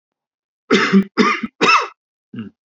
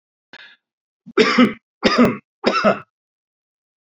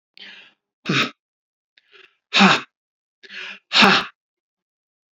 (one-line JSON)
{"cough_length": "2.6 s", "cough_amplitude": 32768, "cough_signal_mean_std_ratio": 0.47, "three_cough_length": "3.8 s", "three_cough_amplitude": 31493, "three_cough_signal_mean_std_ratio": 0.39, "exhalation_length": "5.1 s", "exhalation_amplitude": 28429, "exhalation_signal_mean_std_ratio": 0.31, "survey_phase": "alpha (2021-03-01 to 2021-08-12)", "age": "45-64", "gender": "Male", "wearing_mask": "No", "symptom_none": true, "smoker_status": "Never smoked", "respiratory_condition_asthma": false, "respiratory_condition_other": false, "recruitment_source": "Test and Trace", "submission_delay": "0 days", "covid_test_result": "Negative", "covid_test_method": "LFT"}